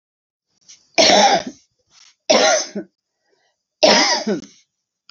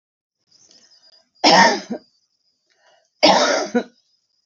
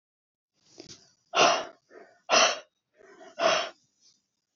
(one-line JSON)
{"three_cough_length": "5.1 s", "three_cough_amplitude": 30450, "three_cough_signal_mean_std_ratio": 0.43, "cough_length": "4.5 s", "cough_amplitude": 32767, "cough_signal_mean_std_ratio": 0.36, "exhalation_length": "4.6 s", "exhalation_amplitude": 13853, "exhalation_signal_mean_std_ratio": 0.35, "survey_phase": "beta (2021-08-13 to 2022-03-07)", "age": "45-64", "gender": "Female", "wearing_mask": "No", "symptom_cough_any": true, "symptom_runny_or_blocked_nose": true, "symptom_shortness_of_breath": true, "symptom_sore_throat": true, "symptom_fatigue": true, "symptom_fever_high_temperature": true, "symptom_change_to_sense_of_smell_or_taste": true, "smoker_status": "Never smoked", "recruitment_source": "Test and Trace", "submission_delay": "5 days", "covid_test_result": "Positive", "covid_test_method": "LFT"}